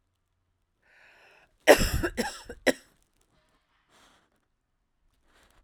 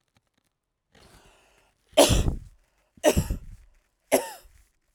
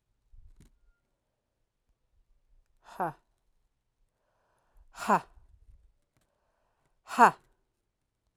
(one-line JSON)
{"cough_length": "5.6 s", "cough_amplitude": 26843, "cough_signal_mean_std_ratio": 0.21, "three_cough_length": "4.9 s", "three_cough_amplitude": 22581, "three_cough_signal_mean_std_ratio": 0.3, "exhalation_length": "8.4 s", "exhalation_amplitude": 16353, "exhalation_signal_mean_std_ratio": 0.16, "survey_phase": "beta (2021-08-13 to 2022-03-07)", "age": "45-64", "gender": "Female", "wearing_mask": "No", "symptom_runny_or_blocked_nose": true, "symptom_shortness_of_breath": true, "symptom_sore_throat": true, "symptom_fatigue": true, "symptom_headache": true, "symptom_change_to_sense_of_smell_or_taste": true, "smoker_status": "Ex-smoker", "respiratory_condition_asthma": false, "respiratory_condition_other": false, "recruitment_source": "Test and Trace", "submission_delay": "1 day", "covid_test_result": "Positive", "covid_test_method": "RT-qPCR", "covid_ct_value": 23.0, "covid_ct_gene": "ORF1ab gene", "covid_ct_mean": 23.7, "covid_viral_load": "17000 copies/ml", "covid_viral_load_category": "Low viral load (10K-1M copies/ml)"}